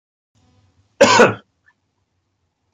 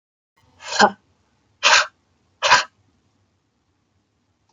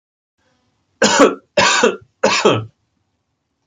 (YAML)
cough_length: 2.7 s
cough_amplitude: 32768
cough_signal_mean_std_ratio: 0.27
exhalation_length: 4.5 s
exhalation_amplitude: 32768
exhalation_signal_mean_std_ratio: 0.28
three_cough_length: 3.7 s
three_cough_amplitude: 29964
three_cough_signal_mean_std_ratio: 0.44
survey_phase: beta (2021-08-13 to 2022-03-07)
age: 45-64
gender: Male
wearing_mask: 'No'
symptom_none: true
symptom_onset: 6 days
smoker_status: Never smoked
respiratory_condition_asthma: false
respiratory_condition_other: false
recruitment_source: REACT
submission_delay: 1 day
covid_test_result: Negative
covid_test_method: RT-qPCR
influenza_a_test_result: Negative
influenza_b_test_result: Negative